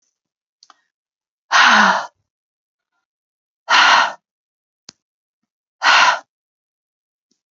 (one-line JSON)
{"exhalation_length": "7.5 s", "exhalation_amplitude": 31390, "exhalation_signal_mean_std_ratio": 0.33, "survey_phase": "beta (2021-08-13 to 2022-03-07)", "age": "45-64", "gender": "Female", "wearing_mask": "No", "symptom_runny_or_blocked_nose": true, "smoker_status": "Never smoked", "respiratory_condition_asthma": false, "respiratory_condition_other": false, "recruitment_source": "REACT", "submission_delay": "6 days", "covid_test_result": "Negative", "covid_test_method": "RT-qPCR", "covid_ct_value": 47.0, "covid_ct_gene": "N gene"}